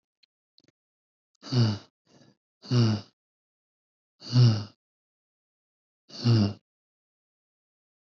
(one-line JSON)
{"exhalation_length": "8.1 s", "exhalation_amplitude": 11097, "exhalation_signal_mean_std_ratio": 0.31, "survey_phase": "beta (2021-08-13 to 2022-03-07)", "age": "18-44", "gender": "Male", "wearing_mask": "No", "symptom_none": true, "smoker_status": "Ex-smoker", "respiratory_condition_asthma": false, "respiratory_condition_other": false, "recruitment_source": "REACT", "submission_delay": "2 days", "covid_test_result": "Negative", "covid_test_method": "RT-qPCR", "influenza_a_test_result": "Negative", "influenza_b_test_result": "Negative"}